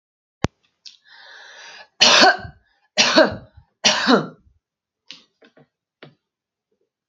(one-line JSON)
{"three_cough_length": "7.1 s", "three_cough_amplitude": 32768, "three_cough_signal_mean_std_ratio": 0.32, "survey_phase": "beta (2021-08-13 to 2022-03-07)", "age": "18-44", "gender": "Female", "wearing_mask": "No", "symptom_none": true, "smoker_status": "Never smoked", "respiratory_condition_asthma": false, "respiratory_condition_other": false, "recruitment_source": "REACT", "submission_delay": "4 days", "covid_test_result": "Negative", "covid_test_method": "RT-qPCR", "influenza_a_test_result": "Negative", "influenza_b_test_result": "Negative"}